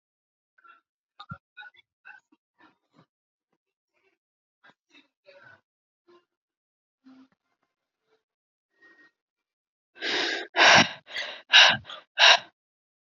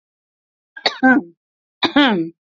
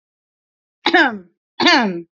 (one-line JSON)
{"exhalation_length": "13.1 s", "exhalation_amplitude": 26248, "exhalation_signal_mean_std_ratio": 0.22, "three_cough_length": "2.6 s", "three_cough_amplitude": 28442, "three_cough_signal_mean_std_ratio": 0.4, "cough_length": "2.1 s", "cough_amplitude": 30591, "cough_signal_mean_std_ratio": 0.44, "survey_phase": "beta (2021-08-13 to 2022-03-07)", "age": "18-44", "gender": "Female", "wearing_mask": "No", "symptom_diarrhoea": true, "symptom_headache": true, "smoker_status": "Never smoked", "respiratory_condition_asthma": false, "respiratory_condition_other": false, "recruitment_source": "REACT", "submission_delay": "0 days", "covid_test_result": "Negative", "covid_test_method": "RT-qPCR", "influenza_a_test_result": "Negative", "influenza_b_test_result": "Negative"}